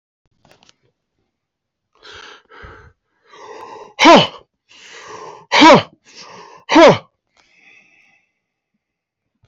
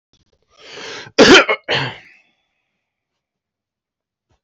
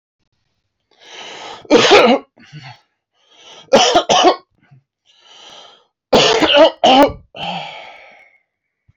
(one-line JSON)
{"exhalation_length": "9.5 s", "exhalation_amplitude": 32768, "exhalation_signal_mean_std_ratio": 0.27, "cough_length": "4.4 s", "cough_amplitude": 32768, "cough_signal_mean_std_ratio": 0.28, "three_cough_length": "9.0 s", "three_cough_amplitude": 31505, "three_cough_signal_mean_std_ratio": 0.42, "survey_phase": "beta (2021-08-13 to 2022-03-07)", "age": "45-64", "gender": "Male", "wearing_mask": "Yes", "symptom_cough_any": true, "symptom_runny_or_blocked_nose": true, "symptom_sore_throat": true, "symptom_fatigue": true, "symptom_headache": true, "smoker_status": "Never smoked", "respiratory_condition_asthma": false, "respiratory_condition_other": false, "recruitment_source": "Test and Trace", "submission_delay": "18 days", "covid_test_result": "Negative", "covid_test_method": "RT-qPCR"}